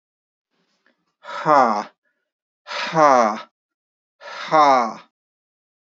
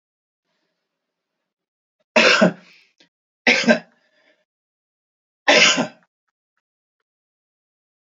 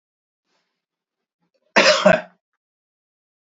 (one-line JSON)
{"exhalation_length": "6.0 s", "exhalation_amplitude": 27211, "exhalation_signal_mean_std_ratio": 0.37, "three_cough_length": "8.1 s", "three_cough_amplitude": 29721, "three_cough_signal_mean_std_ratio": 0.28, "cough_length": "3.4 s", "cough_amplitude": 28021, "cough_signal_mean_std_ratio": 0.26, "survey_phase": "beta (2021-08-13 to 2022-03-07)", "age": "45-64", "gender": "Male", "wearing_mask": "No", "symptom_none": true, "symptom_onset": "9 days", "smoker_status": "Never smoked", "respiratory_condition_asthma": false, "respiratory_condition_other": false, "recruitment_source": "Test and Trace", "submission_delay": "2 days", "covid_test_result": "Positive", "covid_test_method": "RT-qPCR"}